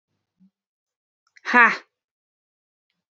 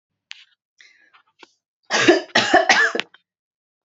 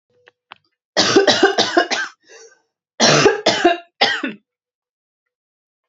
{
  "exhalation_length": "3.2 s",
  "exhalation_amplitude": 32767,
  "exhalation_signal_mean_std_ratio": 0.19,
  "three_cough_length": "3.8 s",
  "three_cough_amplitude": 31406,
  "three_cough_signal_mean_std_ratio": 0.37,
  "cough_length": "5.9 s",
  "cough_amplitude": 30837,
  "cough_signal_mean_std_ratio": 0.45,
  "survey_phase": "alpha (2021-03-01 to 2021-08-12)",
  "age": "18-44",
  "gender": "Female",
  "wearing_mask": "No",
  "symptom_cough_any": true,
  "symptom_abdominal_pain": true,
  "symptom_fatigue": true,
  "symptom_fever_high_temperature": true,
  "symptom_headache": true,
  "symptom_change_to_sense_of_smell_or_taste": true,
  "symptom_onset": "3 days",
  "smoker_status": "Never smoked",
  "respiratory_condition_asthma": false,
  "respiratory_condition_other": false,
  "recruitment_source": "Test and Trace",
  "submission_delay": "1 day",
  "covid_test_result": "Positive",
  "covid_test_method": "RT-qPCR",
  "covid_ct_value": 19.2,
  "covid_ct_gene": "ORF1ab gene",
  "covid_ct_mean": 19.8,
  "covid_viral_load": "320000 copies/ml",
  "covid_viral_load_category": "Low viral load (10K-1M copies/ml)"
}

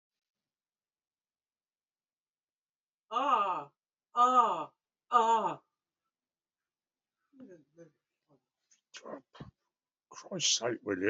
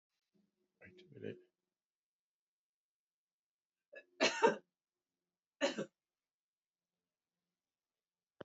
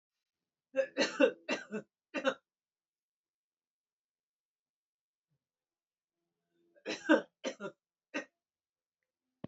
{
  "exhalation_length": "11.1 s",
  "exhalation_amplitude": 7361,
  "exhalation_signal_mean_std_ratio": 0.34,
  "cough_length": "8.4 s",
  "cough_amplitude": 4839,
  "cough_signal_mean_std_ratio": 0.19,
  "three_cough_length": "9.5 s",
  "three_cough_amplitude": 7516,
  "three_cough_signal_mean_std_ratio": 0.24,
  "survey_phase": "beta (2021-08-13 to 2022-03-07)",
  "age": "65+",
  "gender": "Female",
  "wearing_mask": "No",
  "symptom_fatigue": true,
  "smoker_status": "Never smoked",
  "respiratory_condition_asthma": false,
  "respiratory_condition_other": false,
  "recruitment_source": "Test and Trace",
  "submission_delay": "3 days",
  "covid_test_result": "Positive",
  "covid_test_method": "RT-qPCR",
  "covid_ct_value": 27.5,
  "covid_ct_gene": "ORF1ab gene",
  "covid_ct_mean": 28.4,
  "covid_viral_load": "490 copies/ml",
  "covid_viral_load_category": "Minimal viral load (< 10K copies/ml)"
}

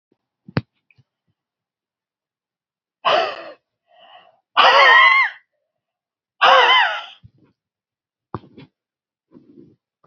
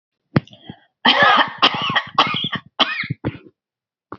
{
  "exhalation_length": "10.1 s",
  "exhalation_amplitude": 29402,
  "exhalation_signal_mean_std_ratio": 0.33,
  "cough_length": "4.2 s",
  "cough_amplitude": 29647,
  "cough_signal_mean_std_ratio": 0.47,
  "survey_phase": "alpha (2021-03-01 to 2021-08-12)",
  "age": "65+",
  "gender": "Female",
  "wearing_mask": "No",
  "symptom_none": true,
  "smoker_status": "Never smoked",
  "respiratory_condition_asthma": false,
  "respiratory_condition_other": false,
  "recruitment_source": "REACT",
  "submission_delay": "1 day",
  "covid_test_result": "Negative",
  "covid_test_method": "RT-qPCR"
}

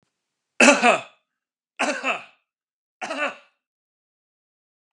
{
  "three_cough_length": "4.9 s",
  "three_cough_amplitude": 31485,
  "three_cough_signal_mean_std_ratio": 0.29,
  "survey_phase": "beta (2021-08-13 to 2022-03-07)",
  "age": "65+",
  "gender": "Male",
  "wearing_mask": "No",
  "symptom_none": true,
  "smoker_status": "Ex-smoker",
  "respiratory_condition_asthma": false,
  "respiratory_condition_other": false,
  "recruitment_source": "REACT",
  "submission_delay": "1 day",
  "covid_test_result": "Negative",
  "covid_test_method": "RT-qPCR",
  "influenza_a_test_result": "Negative",
  "influenza_b_test_result": "Negative"
}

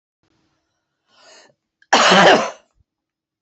{
  "cough_length": "3.4 s",
  "cough_amplitude": 29117,
  "cough_signal_mean_std_ratio": 0.33,
  "survey_phase": "beta (2021-08-13 to 2022-03-07)",
  "age": "65+",
  "gender": "Female",
  "wearing_mask": "No",
  "symptom_none": true,
  "smoker_status": "Ex-smoker",
  "respiratory_condition_asthma": false,
  "respiratory_condition_other": false,
  "recruitment_source": "REACT",
  "submission_delay": "1 day",
  "covid_test_result": "Negative",
  "covid_test_method": "RT-qPCR"
}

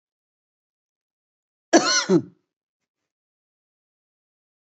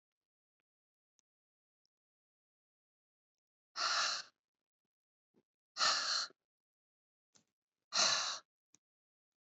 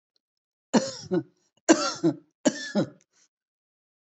{
  "cough_length": "4.6 s",
  "cough_amplitude": 27955,
  "cough_signal_mean_std_ratio": 0.22,
  "exhalation_length": "9.5 s",
  "exhalation_amplitude": 4147,
  "exhalation_signal_mean_std_ratio": 0.3,
  "three_cough_length": "4.0 s",
  "three_cough_amplitude": 21459,
  "three_cough_signal_mean_std_ratio": 0.34,
  "survey_phase": "beta (2021-08-13 to 2022-03-07)",
  "age": "45-64",
  "gender": "Female",
  "wearing_mask": "No",
  "symptom_none": true,
  "symptom_onset": "11 days",
  "smoker_status": "Current smoker (1 to 10 cigarettes per day)",
  "respiratory_condition_asthma": false,
  "respiratory_condition_other": false,
  "recruitment_source": "REACT",
  "submission_delay": "2 days",
  "covid_test_result": "Negative",
  "covid_test_method": "RT-qPCR",
  "influenza_a_test_result": "Negative",
  "influenza_b_test_result": "Negative"
}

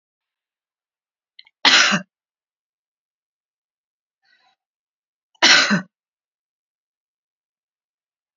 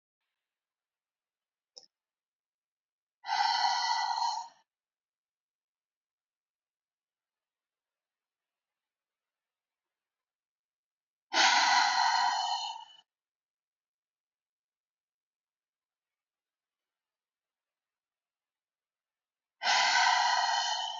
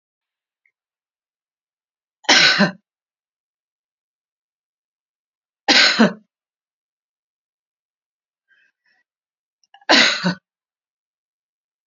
{
  "cough_length": "8.4 s",
  "cough_amplitude": 32767,
  "cough_signal_mean_std_ratio": 0.23,
  "exhalation_length": "21.0 s",
  "exhalation_amplitude": 7554,
  "exhalation_signal_mean_std_ratio": 0.34,
  "three_cough_length": "11.9 s",
  "three_cough_amplitude": 31241,
  "three_cough_signal_mean_std_ratio": 0.25,
  "survey_phase": "beta (2021-08-13 to 2022-03-07)",
  "age": "65+",
  "gender": "Female",
  "wearing_mask": "No",
  "symptom_none": true,
  "smoker_status": "Never smoked",
  "respiratory_condition_asthma": false,
  "respiratory_condition_other": false,
  "recruitment_source": "REACT",
  "submission_delay": "0 days",
  "covid_test_result": "Negative",
  "covid_test_method": "RT-qPCR",
  "influenza_a_test_result": "Negative",
  "influenza_b_test_result": "Negative"
}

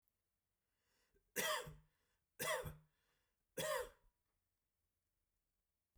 {
  "three_cough_length": "6.0 s",
  "three_cough_amplitude": 1608,
  "three_cough_signal_mean_std_ratio": 0.33,
  "survey_phase": "beta (2021-08-13 to 2022-03-07)",
  "age": "18-44",
  "gender": "Male",
  "wearing_mask": "No",
  "symptom_none": true,
  "smoker_status": "Ex-smoker",
  "respiratory_condition_asthma": false,
  "respiratory_condition_other": false,
  "recruitment_source": "REACT",
  "submission_delay": "0 days",
  "covid_test_result": "Negative",
  "covid_test_method": "RT-qPCR"
}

